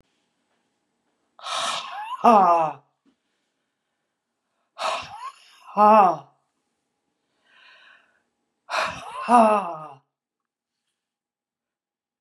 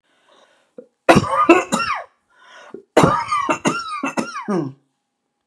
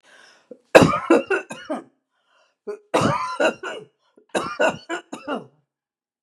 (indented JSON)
{
  "exhalation_length": "12.2 s",
  "exhalation_amplitude": 26848,
  "exhalation_signal_mean_std_ratio": 0.31,
  "three_cough_length": "5.5 s",
  "three_cough_amplitude": 32768,
  "three_cough_signal_mean_std_ratio": 0.45,
  "cough_length": "6.2 s",
  "cough_amplitude": 32768,
  "cough_signal_mean_std_ratio": 0.37,
  "survey_phase": "beta (2021-08-13 to 2022-03-07)",
  "age": "65+",
  "gender": "Female",
  "wearing_mask": "No",
  "symptom_none": true,
  "smoker_status": "Never smoked",
  "respiratory_condition_asthma": false,
  "respiratory_condition_other": false,
  "recruitment_source": "REACT",
  "submission_delay": "6 days",
  "covid_test_result": "Negative",
  "covid_test_method": "RT-qPCR"
}